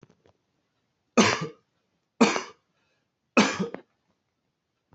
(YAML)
three_cough_length: 4.9 s
three_cough_amplitude: 18640
three_cough_signal_mean_std_ratio: 0.28
survey_phase: beta (2021-08-13 to 2022-03-07)
age: 18-44
gender: Male
wearing_mask: 'No'
symptom_none: true
smoker_status: Never smoked
respiratory_condition_asthma: false
respiratory_condition_other: false
recruitment_source: REACT
submission_delay: 1 day
covid_test_result: Negative
covid_test_method: RT-qPCR
influenza_a_test_result: Negative
influenza_b_test_result: Negative